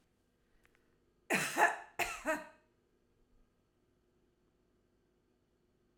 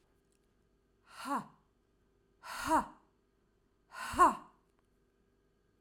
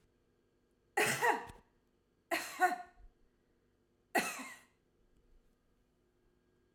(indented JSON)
{
  "cough_length": "6.0 s",
  "cough_amplitude": 6768,
  "cough_signal_mean_std_ratio": 0.27,
  "exhalation_length": "5.8 s",
  "exhalation_amplitude": 7335,
  "exhalation_signal_mean_std_ratio": 0.27,
  "three_cough_length": "6.7 s",
  "three_cough_amplitude": 4619,
  "three_cough_signal_mean_std_ratio": 0.32,
  "survey_phase": "alpha (2021-03-01 to 2021-08-12)",
  "age": "45-64",
  "gender": "Female",
  "wearing_mask": "No",
  "symptom_none": true,
  "smoker_status": "Never smoked",
  "respiratory_condition_asthma": false,
  "respiratory_condition_other": false,
  "recruitment_source": "REACT",
  "submission_delay": "3 days",
  "covid_test_result": "Negative",
  "covid_test_method": "RT-qPCR"
}